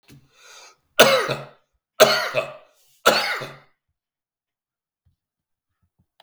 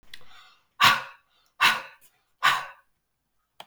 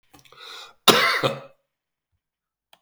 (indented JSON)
{
  "three_cough_length": "6.2 s",
  "three_cough_amplitude": 32768,
  "three_cough_signal_mean_std_ratio": 0.3,
  "exhalation_length": "3.7 s",
  "exhalation_amplitude": 20263,
  "exhalation_signal_mean_std_ratio": 0.33,
  "cough_length": "2.8 s",
  "cough_amplitude": 32768,
  "cough_signal_mean_std_ratio": 0.31,
  "survey_phase": "beta (2021-08-13 to 2022-03-07)",
  "age": "45-64",
  "gender": "Male",
  "wearing_mask": "No",
  "symptom_cough_any": true,
  "symptom_runny_or_blocked_nose": true,
  "symptom_headache": true,
  "symptom_loss_of_taste": true,
  "smoker_status": "Never smoked",
  "respiratory_condition_asthma": false,
  "respiratory_condition_other": false,
  "recruitment_source": "Test and Trace",
  "submission_delay": "2 days",
  "covid_test_result": "Positive",
  "covid_test_method": "RT-qPCR",
  "covid_ct_value": 16.8,
  "covid_ct_gene": "S gene",
  "covid_ct_mean": 17.2,
  "covid_viral_load": "2300000 copies/ml",
  "covid_viral_load_category": "High viral load (>1M copies/ml)"
}